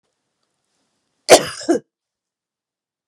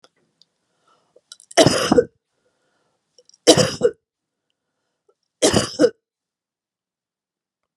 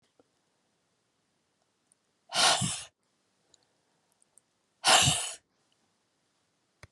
cough_length: 3.1 s
cough_amplitude: 32768
cough_signal_mean_std_ratio: 0.2
three_cough_length: 7.8 s
three_cough_amplitude: 32768
three_cough_signal_mean_std_ratio: 0.27
exhalation_length: 6.9 s
exhalation_amplitude: 13154
exhalation_signal_mean_std_ratio: 0.27
survey_phase: beta (2021-08-13 to 2022-03-07)
age: 45-64
gender: Female
wearing_mask: 'No'
symptom_none: true
smoker_status: Never smoked
respiratory_condition_asthma: false
respiratory_condition_other: false
recruitment_source: REACT
submission_delay: 3 days
covid_test_result: Negative
covid_test_method: RT-qPCR
influenza_a_test_result: Negative
influenza_b_test_result: Negative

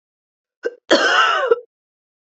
cough_length: 2.3 s
cough_amplitude: 27937
cough_signal_mean_std_ratio: 0.46
survey_phase: beta (2021-08-13 to 2022-03-07)
age: 45-64
gender: Female
wearing_mask: 'No'
symptom_change_to_sense_of_smell_or_taste: true
symptom_onset: 12 days
smoker_status: Never smoked
respiratory_condition_asthma: false
respiratory_condition_other: false
recruitment_source: REACT
submission_delay: 1 day
covid_test_result: Negative
covid_test_method: RT-qPCR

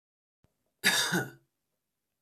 cough_length: 2.2 s
cough_amplitude: 9445
cough_signal_mean_std_ratio: 0.34
survey_phase: beta (2021-08-13 to 2022-03-07)
age: 18-44
gender: Male
wearing_mask: 'No'
symptom_none: true
smoker_status: Never smoked
respiratory_condition_asthma: true
respiratory_condition_other: false
recruitment_source: REACT
submission_delay: 1 day
covid_test_result: Negative
covid_test_method: RT-qPCR
influenza_a_test_result: Negative
influenza_b_test_result: Negative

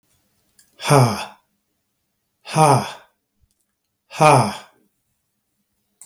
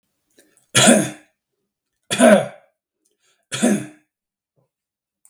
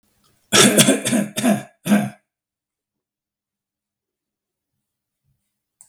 exhalation_length: 6.1 s
exhalation_amplitude: 32766
exhalation_signal_mean_std_ratio: 0.31
three_cough_length: 5.3 s
three_cough_amplitude: 32768
three_cough_signal_mean_std_ratio: 0.32
cough_length: 5.9 s
cough_amplitude: 32768
cough_signal_mean_std_ratio: 0.33
survey_phase: beta (2021-08-13 to 2022-03-07)
age: 65+
gender: Male
wearing_mask: 'No'
symptom_none: true
smoker_status: Never smoked
respiratory_condition_asthma: false
respiratory_condition_other: false
recruitment_source: REACT
submission_delay: 0 days
covid_test_result: Negative
covid_test_method: RT-qPCR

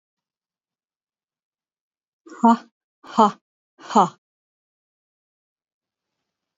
exhalation_length: 6.6 s
exhalation_amplitude: 26526
exhalation_signal_mean_std_ratio: 0.19
survey_phase: beta (2021-08-13 to 2022-03-07)
age: 65+
gender: Female
wearing_mask: 'No'
symptom_none: true
smoker_status: Never smoked
respiratory_condition_asthma: false
respiratory_condition_other: false
recruitment_source: REACT
submission_delay: 2 days
covid_test_result: Negative
covid_test_method: RT-qPCR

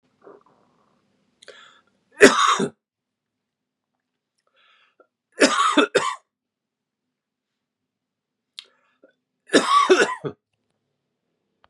three_cough_length: 11.7 s
three_cough_amplitude: 32768
three_cough_signal_mean_std_ratio: 0.28
survey_phase: beta (2021-08-13 to 2022-03-07)
age: 45-64
gender: Male
wearing_mask: 'No'
symptom_cough_any: true
symptom_runny_or_blocked_nose: true
symptom_sore_throat: true
symptom_headache: true
smoker_status: Never smoked
respiratory_condition_asthma: false
respiratory_condition_other: false
recruitment_source: Test and Trace
submission_delay: 1 day
covid_test_result: Positive
covid_test_method: LFT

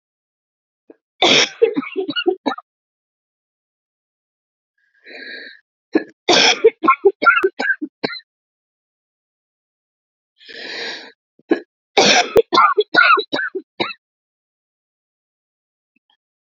three_cough_length: 16.6 s
three_cough_amplitude: 32767
three_cough_signal_mean_std_ratio: 0.35
survey_phase: beta (2021-08-13 to 2022-03-07)
age: 45-64
gender: Female
wearing_mask: 'No'
symptom_cough_any: true
symptom_shortness_of_breath: true
symptom_abdominal_pain: true
symptom_fatigue: true
symptom_fever_high_temperature: true
symptom_headache: true
symptom_change_to_sense_of_smell_or_taste: true
symptom_onset: 3 days
smoker_status: Never smoked
respiratory_condition_asthma: false
respiratory_condition_other: false
recruitment_source: Test and Trace
submission_delay: 1 day
covid_test_result: Positive
covid_test_method: RT-qPCR
covid_ct_value: 23.1
covid_ct_gene: N gene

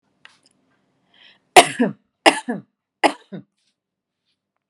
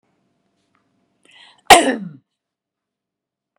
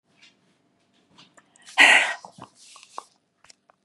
three_cough_length: 4.7 s
three_cough_amplitude: 32768
three_cough_signal_mean_std_ratio: 0.21
cough_length: 3.6 s
cough_amplitude: 32768
cough_signal_mean_std_ratio: 0.19
exhalation_length: 3.8 s
exhalation_amplitude: 31005
exhalation_signal_mean_std_ratio: 0.24
survey_phase: beta (2021-08-13 to 2022-03-07)
age: 45-64
gender: Female
wearing_mask: 'No'
symptom_none: true
symptom_onset: 5 days
smoker_status: Never smoked
respiratory_condition_asthma: false
respiratory_condition_other: false
recruitment_source: REACT
submission_delay: 1 day
covid_test_result: Negative
covid_test_method: RT-qPCR
influenza_a_test_result: Unknown/Void
influenza_b_test_result: Unknown/Void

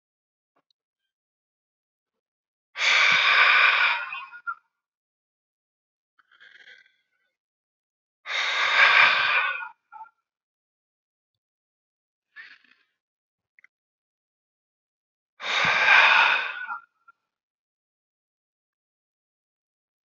exhalation_length: 20.1 s
exhalation_amplitude: 20179
exhalation_signal_mean_std_ratio: 0.35
survey_phase: beta (2021-08-13 to 2022-03-07)
age: 45-64
gender: Male
wearing_mask: 'No'
symptom_cough_any: true
symptom_fatigue: true
symptom_other: true
symptom_onset: 8 days
smoker_status: Never smoked
respiratory_condition_asthma: false
respiratory_condition_other: false
recruitment_source: REACT
submission_delay: 1 day
covid_test_result: Negative
covid_test_method: RT-qPCR
influenza_a_test_result: Negative
influenza_b_test_result: Negative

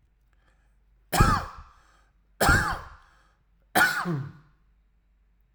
three_cough_length: 5.5 s
three_cough_amplitude: 17159
three_cough_signal_mean_std_ratio: 0.37
survey_phase: alpha (2021-03-01 to 2021-08-12)
age: 18-44
gender: Male
wearing_mask: 'No'
symptom_none: true
smoker_status: Ex-smoker
respiratory_condition_asthma: false
respiratory_condition_other: false
recruitment_source: REACT
submission_delay: 3 days
covid_test_result: Negative
covid_test_method: RT-qPCR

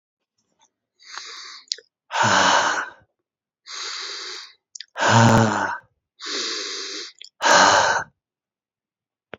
exhalation_length: 9.4 s
exhalation_amplitude: 29756
exhalation_signal_mean_std_ratio: 0.45
survey_phase: beta (2021-08-13 to 2022-03-07)
age: 45-64
gender: Male
wearing_mask: 'No'
symptom_cough_any: true
symptom_runny_or_blocked_nose: true
symptom_fatigue: true
symptom_fever_high_temperature: true
symptom_headache: true
symptom_change_to_sense_of_smell_or_taste: true
symptom_onset: 6 days
smoker_status: Never smoked
respiratory_condition_asthma: false
respiratory_condition_other: false
recruitment_source: Test and Trace
submission_delay: 1 day
covid_test_result: Positive
covid_test_method: RT-qPCR
covid_ct_value: 15.1
covid_ct_gene: ORF1ab gene
covid_ct_mean: 15.4
covid_viral_load: 8900000 copies/ml
covid_viral_load_category: High viral load (>1M copies/ml)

